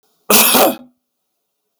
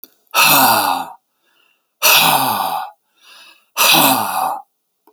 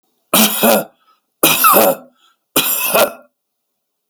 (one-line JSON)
{"cough_length": "1.8 s", "cough_amplitude": 32768, "cough_signal_mean_std_ratio": 0.42, "exhalation_length": "5.1 s", "exhalation_amplitude": 32768, "exhalation_signal_mean_std_ratio": 0.57, "three_cough_length": "4.1 s", "three_cough_amplitude": 32768, "three_cough_signal_mean_std_ratio": 0.51, "survey_phase": "alpha (2021-03-01 to 2021-08-12)", "age": "45-64", "gender": "Male", "wearing_mask": "No", "symptom_none": true, "smoker_status": "Ex-smoker", "respiratory_condition_asthma": false, "respiratory_condition_other": false, "recruitment_source": "REACT", "submission_delay": "3 days", "covid_test_result": "Negative", "covid_test_method": "RT-qPCR"}